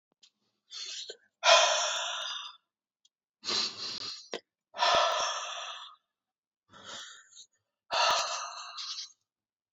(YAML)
exhalation_length: 9.7 s
exhalation_amplitude: 15329
exhalation_signal_mean_std_ratio: 0.45
survey_phase: beta (2021-08-13 to 2022-03-07)
age: 18-44
gender: Male
wearing_mask: 'No'
symptom_cough_any: true
symptom_new_continuous_cough: true
symptom_runny_or_blocked_nose: true
symptom_fatigue: true
symptom_fever_high_temperature: true
symptom_onset: 10 days
smoker_status: Current smoker (e-cigarettes or vapes only)
respiratory_condition_asthma: false
respiratory_condition_other: false
recruitment_source: Test and Trace
submission_delay: 0 days
covid_test_result: Positive
covid_test_method: ePCR